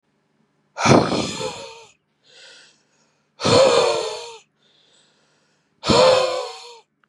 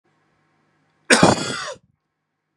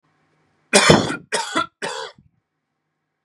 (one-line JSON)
{"exhalation_length": "7.1 s", "exhalation_amplitude": 30672, "exhalation_signal_mean_std_ratio": 0.43, "cough_length": "2.6 s", "cough_amplitude": 32767, "cough_signal_mean_std_ratio": 0.3, "three_cough_length": "3.2 s", "three_cough_amplitude": 32768, "three_cough_signal_mean_std_ratio": 0.35, "survey_phase": "beta (2021-08-13 to 2022-03-07)", "age": "18-44", "gender": "Male", "wearing_mask": "No", "symptom_fatigue": true, "symptom_onset": "12 days", "smoker_status": "Never smoked", "respiratory_condition_asthma": false, "respiratory_condition_other": false, "recruitment_source": "REACT", "submission_delay": "1 day", "covid_test_result": "Negative", "covid_test_method": "RT-qPCR", "influenza_a_test_result": "Negative", "influenza_b_test_result": "Negative"}